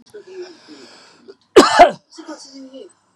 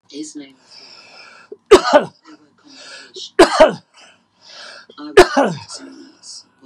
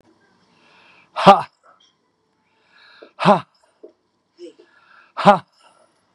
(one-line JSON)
{"cough_length": "3.2 s", "cough_amplitude": 32768, "cough_signal_mean_std_ratio": 0.29, "three_cough_length": "6.7 s", "three_cough_amplitude": 32768, "three_cough_signal_mean_std_ratio": 0.31, "exhalation_length": "6.1 s", "exhalation_amplitude": 32768, "exhalation_signal_mean_std_ratio": 0.22, "survey_phase": "beta (2021-08-13 to 2022-03-07)", "age": "65+", "gender": "Female", "wearing_mask": "No", "symptom_none": true, "smoker_status": "Never smoked", "respiratory_condition_asthma": false, "respiratory_condition_other": false, "recruitment_source": "REACT", "submission_delay": "1 day", "covid_test_result": "Negative", "covid_test_method": "RT-qPCR", "influenza_a_test_result": "Negative", "influenza_b_test_result": "Negative"}